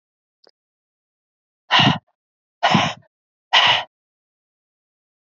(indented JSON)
{
  "exhalation_length": "5.4 s",
  "exhalation_amplitude": 27365,
  "exhalation_signal_mean_std_ratio": 0.31,
  "survey_phase": "alpha (2021-03-01 to 2021-08-12)",
  "age": "45-64",
  "gender": "Female",
  "wearing_mask": "No",
  "symptom_shortness_of_breath": true,
  "smoker_status": "Prefer not to say",
  "recruitment_source": "REACT",
  "submission_delay": "1 day",
  "covid_test_result": "Negative",
  "covid_test_method": "RT-qPCR"
}